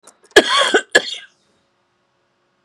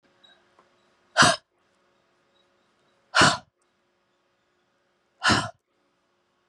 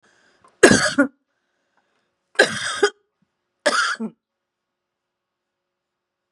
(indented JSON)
{
  "cough_length": "2.6 s",
  "cough_amplitude": 32768,
  "cough_signal_mean_std_ratio": 0.32,
  "exhalation_length": "6.5 s",
  "exhalation_amplitude": 22460,
  "exhalation_signal_mean_std_ratio": 0.24,
  "three_cough_length": "6.3 s",
  "three_cough_amplitude": 32768,
  "three_cough_signal_mean_std_ratio": 0.29,
  "survey_phase": "beta (2021-08-13 to 2022-03-07)",
  "age": "45-64",
  "gender": "Female",
  "wearing_mask": "No",
  "symptom_fatigue": true,
  "symptom_headache": true,
  "symptom_onset": "12 days",
  "smoker_status": "Never smoked",
  "respiratory_condition_asthma": true,
  "respiratory_condition_other": false,
  "recruitment_source": "REACT",
  "submission_delay": "8 days",
  "covid_test_result": "Negative",
  "covid_test_method": "RT-qPCR",
  "influenza_a_test_result": "Negative",
  "influenza_b_test_result": "Negative"
}